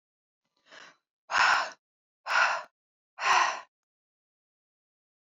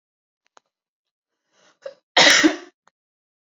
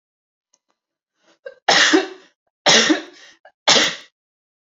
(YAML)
exhalation_length: 5.3 s
exhalation_amplitude: 9251
exhalation_signal_mean_std_ratio: 0.36
cough_length: 3.6 s
cough_amplitude: 29930
cough_signal_mean_std_ratio: 0.26
three_cough_length: 4.7 s
three_cough_amplitude: 32768
three_cough_signal_mean_std_ratio: 0.37
survey_phase: beta (2021-08-13 to 2022-03-07)
age: 18-44
gender: Female
wearing_mask: 'No'
symptom_none: true
symptom_onset: 12 days
smoker_status: Never smoked
respiratory_condition_asthma: false
respiratory_condition_other: false
recruitment_source: REACT
submission_delay: 1 day
covid_test_result: Negative
covid_test_method: RT-qPCR